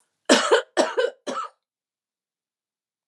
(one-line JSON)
{"cough_length": "3.1 s", "cough_amplitude": 29540, "cough_signal_mean_std_ratio": 0.36, "survey_phase": "beta (2021-08-13 to 2022-03-07)", "age": "65+", "gender": "Female", "wearing_mask": "No", "symptom_none": true, "smoker_status": "Never smoked", "respiratory_condition_asthma": false, "respiratory_condition_other": false, "recruitment_source": "REACT", "submission_delay": "2 days", "covid_test_result": "Negative", "covid_test_method": "RT-qPCR", "influenza_a_test_result": "Unknown/Void", "influenza_b_test_result": "Unknown/Void"}